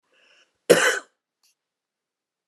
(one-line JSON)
{"cough_length": "2.5 s", "cough_amplitude": 28627, "cough_signal_mean_std_ratio": 0.24, "survey_phase": "beta (2021-08-13 to 2022-03-07)", "age": "45-64", "gender": "Male", "wearing_mask": "No", "symptom_none": true, "smoker_status": "Never smoked", "respiratory_condition_asthma": false, "respiratory_condition_other": false, "recruitment_source": "REACT", "submission_delay": "1 day", "covid_test_result": "Negative", "covid_test_method": "RT-qPCR"}